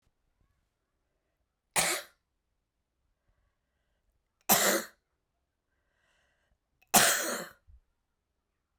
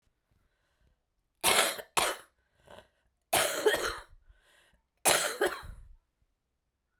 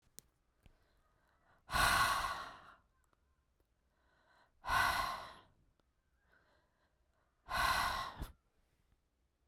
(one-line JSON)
{"three_cough_length": "8.8 s", "three_cough_amplitude": 15326, "three_cough_signal_mean_std_ratio": 0.25, "cough_length": "7.0 s", "cough_amplitude": 15592, "cough_signal_mean_std_ratio": 0.38, "exhalation_length": "9.5 s", "exhalation_amplitude": 4229, "exhalation_signal_mean_std_ratio": 0.38, "survey_phase": "beta (2021-08-13 to 2022-03-07)", "age": "45-64", "gender": "Female", "wearing_mask": "No", "symptom_cough_any": true, "symptom_shortness_of_breath": true, "symptom_abdominal_pain": true, "symptom_fatigue": true, "symptom_fever_high_temperature": true, "symptom_headache": true, "symptom_change_to_sense_of_smell_or_taste": true, "symptom_loss_of_taste": true, "symptom_onset": "4 days", "smoker_status": "Current smoker (e-cigarettes or vapes only)", "respiratory_condition_asthma": false, "respiratory_condition_other": false, "recruitment_source": "Test and Trace", "submission_delay": "2 days", "covid_test_result": "Positive", "covid_test_method": "RT-qPCR", "covid_ct_value": 20.4, "covid_ct_gene": "ORF1ab gene", "covid_ct_mean": 21.0, "covid_viral_load": "130000 copies/ml", "covid_viral_load_category": "Low viral load (10K-1M copies/ml)"}